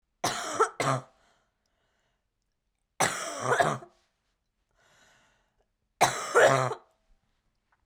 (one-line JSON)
{"three_cough_length": "7.9 s", "three_cough_amplitude": 15399, "three_cough_signal_mean_std_ratio": 0.35, "survey_phase": "beta (2021-08-13 to 2022-03-07)", "age": "18-44", "gender": "Female", "wearing_mask": "No", "symptom_cough_any": true, "symptom_runny_or_blocked_nose": true, "symptom_shortness_of_breath": true, "symptom_sore_throat": true, "symptom_fatigue": true, "symptom_headache": true, "symptom_onset": "3 days", "smoker_status": "Current smoker (e-cigarettes or vapes only)", "respiratory_condition_asthma": true, "respiratory_condition_other": false, "recruitment_source": "Test and Trace", "submission_delay": "2 days", "covid_test_result": "Positive", "covid_test_method": "ePCR"}